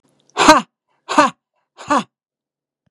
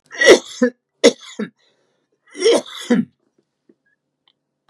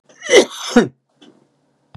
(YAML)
exhalation_length: 2.9 s
exhalation_amplitude: 32768
exhalation_signal_mean_std_ratio: 0.32
three_cough_length: 4.7 s
three_cough_amplitude: 32768
three_cough_signal_mean_std_ratio: 0.32
cough_length: 2.0 s
cough_amplitude: 32768
cough_signal_mean_std_ratio: 0.33
survey_phase: beta (2021-08-13 to 2022-03-07)
age: 65+
gender: Male
wearing_mask: 'No'
symptom_none: true
smoker_status: Ex-smoker
respiratory_condition_asthma: true
respiratory_condition_other: true
recruitment_source: REACT
submission_delay: 2 days
covid_test_result: Negative
covid_test_method: RT-qPCR
influenza_a_test_result: Negative
influenza_b_test_result: Negative